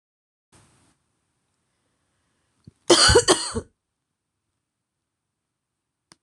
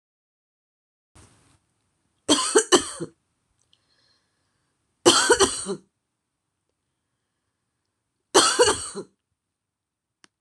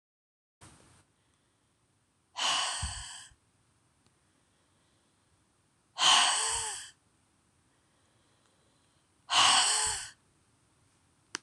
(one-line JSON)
{"cough_length": "6.2 s", "cough_amplitude": 26027, "cough_signal_mean_std_ratio": 0.22, "three_cough_length": "10.4 s", "three_cough_amplitude": 25495, "three_cough_signal_mean_std_ratio": 0.28, "exhalation_length": "11.4 s", "exhalation_amplitude": 10261, "exhalation_signal_mean_std_ratio": 0.33, "survey_phase": "beta (2021-08-13 to 2022-03-07)", "age": "45-64", "gender": "Female", "wearing_mask": "No", "symptom_cough_any": true, "symptom_runny_or_blocked_nose": true, "symptom_sore_throat": true, "symptom_fatigue": true, "symptom_change_to_sense_of_smell_or_taste": true, "smoker_status": "Never smoked", "respiratory_condition_asthma": false, "respiratory_condition_other": false, "recruitment_source": "Test and Trace", "submission_delay": "2 days", "covid_test_result": "Positive", "covid_test_method": "LFT"}